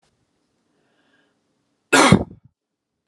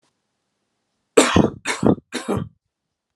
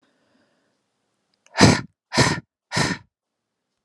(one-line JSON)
{"cough_length": "3.1 s", "cough_amplitude": 32768, "cough_signal_mean_std_ratio": 0.24, "three_cough_length": "3.2 s", "three_cough_amplitude": 32691, "three_cough_signal_mean_std_ratio": 0.34, "exhalation_length": "3.8 s", "exhalation_amplitude": 32768, "exhalation_signal_mean_std_ratio": 0.3, "survey_phase": "alpha (2021-03-01 to 2021-08-12)", "age": "18-44", "gender": "Male", "wearing_mask": "No", "symptom_fatigue": true, "symptom_onset": "12 days", "smoker_status": "Prefer not to say", "respiratory_condition_asthma": false, "respiratory_condition_other": false, "recruitment_source": "REACT", "submission_delay": "1 day", "covid_test_result": "Negative", "covid_test_method": "RT-qPCR"}